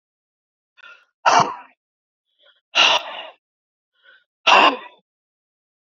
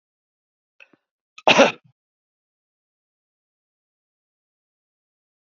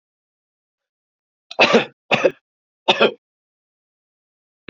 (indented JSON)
{
  "exhalation_length": "5.9 s",
  "exhalation_amplitude": 28531,
  "exhalation_signal_mean_std_ratio": 0.3,
  "cough_length": "5.5 s",
  "cough_amplitude": 28727,
  "cough_signal_mean_std_ratio": 0.15,
  "three_cough_length": "4.7 s",
  "three_cough_amplitude": 30002,
  "three_cough_signal_mean_std_ratio": 0.27,
  "survey_phase": "beta (2021-08-13 to 2022-03-07)",
  "age": "45-64",
  "gender": "Male",
  "wearing_mask": "No",
  "symptom_none": true,
  "smoker_status": "Ex-smoker",
  "respiratory_condition_asthma": true,
  "respiratory_condition_other": false,
  "recruitment_source": "REACT",
  "submission_delay": "8 days",
  "covid_test_result": "Negative",
  "covid_test_method": "RT-qPCR",
  "influenza_a_test_result": "Negative",
  "influenza_b_test_result": "Negative"
}